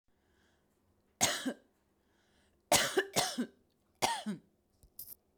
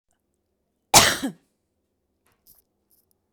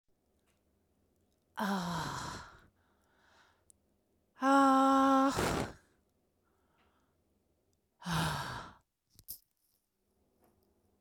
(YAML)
three_cough_length: 5.4 s
three_cough_amplitude: 8832
three_cough_signal_mean_std_ratio: 0.35
cough_length: 3.3 s
cough_amplitude: 29898
cough_signal_mean_std_ratio: 0.21
exhalation_length: 11.0 s
exhalation_amplitude: 4478
exhalation_signal_mean_std_ratio: 0.38
survey_phase: beta (2021-08-13 to 2022-03-07)
age: 45-64
gender: Female
wearing_mask: 'No'
symptom_none: true
smoker_status: Ex-smoker
respiratory_condition_asthma: false
respiratory_condition_other: false
recruitment_source: REACT
submission_delay: 0 days
covid_test_result: Negative
covid_test_method: RT-qPCR
influenza_a_test_result: Negative
influenza_b_test_result: Negative